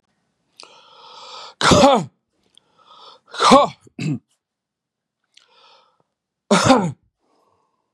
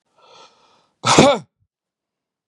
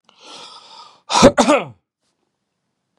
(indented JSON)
{
  "three_cough_length": "7.9 s",
  "three_cough_amplitude": 32767,
  "three_cough_signal_mean_std_ratio": 0.32,
  "cough_length": "2.5 s",
  "cough_amplitude": 32768,
  "cough_signal_mean_std_ratio": 0.29,
  "exhalation_length": "3.0 s",
  "exhalation_amplitude": 32768,
  "exhalation_signal_mean_std_ratio": 0.31,
  "survey_phase": "beta (2021-08-13 to 2022-03-07)",
  "age": "45-64",
  "gender": "Male",
  "wearing_mask": "No",
  "symptom_none": true,
  "smoker_status": "Ex-smoker",
  "respiratory_condition_asthma": false,
  "respiratory_condition_other": false,
  "recruitment_source": "REACT",
  "submission_delay": "4 days",
  "covid_test_result": "Negative",
  "covid_test_method": "RT-qPCR",
  "influenza_a_test_result": "Negative",
  "influenza_b_test_result": "Negative"
}